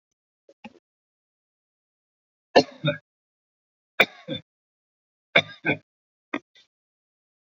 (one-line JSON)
{"three_cough_length": "7.4 s", "three_cough_amplitude": 28867, "three_cough_signal_mean_std_ratio": 0.18, "survey_phase": "beta (2021-08-13 to 2022-03-07)", "age": "65+", "gender": "Male", "wearing_mask": "No", "symptom_none": true, "smoker_status": "Ex-smoker", "respiratory_condition_asthma": false, "respiratory_condition_other": false, "recruitment_source": "REACT", "submission_delay": "2 days", "covid_test_result": "Negative", "covid_test_method": "RT-qPCR"}